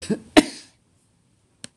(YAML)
cough_length: 1.8 s
cough_amplitude: 26028
cough_signal_mean_std_ratio: 0.21
survey_phase: beta (2021-08-13 to 2022-03-07)
age: 65+
gender: Female
wearing_mask: 'No'
symptom_none: true
smoker_status: Never smoked
respiratory_condition_asthma: false
respiratory_condition_other: false
recruitment_source: REACT
submission_delay: 2 days
covid_test_result: Negative
covid_test_method: RT-qPCR
influenza_a_test_result: Negative
influenza_b_test_result: Negative